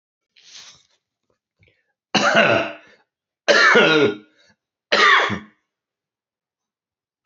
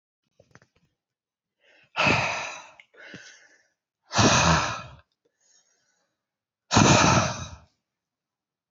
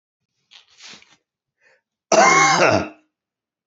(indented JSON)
{
  "three_cough_length": "7.3 s",
  "three_cough_amplitude": 29507,
  "three_cough_signal_mean_std_ratio": 0.39,
  "exhalation_length": "8.7 s",
  "exhalation_amplitude": 18688,
  "exhalation_signal_mean_std_ratio": 0.36,
  "cough_length": "3.7 s",
  "cough_amplitude": 27268,
  "cough_signal_mean_std_ratio": 0.37,
  "survey_phase": "beta (2021-08-13 to 2022-03-07)",
  "age": "18-44",
  "gender": "Male",
  "wearing_mask": "Yes",
  "symptom_cough_any": true,
  "symptom_new_continuous_cough": true,
  "symptom_runny_or_blocked_nose": true,
  "symptom_shortness_of_breath": true,
  "symptom_sore_throat": true,
  "symptom_fatigue": true,
  "symptom_headache": true,
  "symptom_change_to_sense_of_smell_or_taste": true,
  "symptom_onset": "2 days",
  "smoker_status": "Never smoked",
  "respiratory_condition_asthma": false,
  "respiratory_condition_other": false,
  "recruitment_source": "Test and Trace",
  "submission_delay": "2 days",
  "covid_test_result": "Positive",
  "covid_test_method": "RT-qPCR",
  "covid_ct_value": 20.3,
  "covid_ct_gene": "S gene",
  "covid_ct_mean": 21.5,
  "covid_viral_load": "88000 copies/ml",
  "covid_viral_load_category": "Low viral load (10K-1M copies/ml)"
}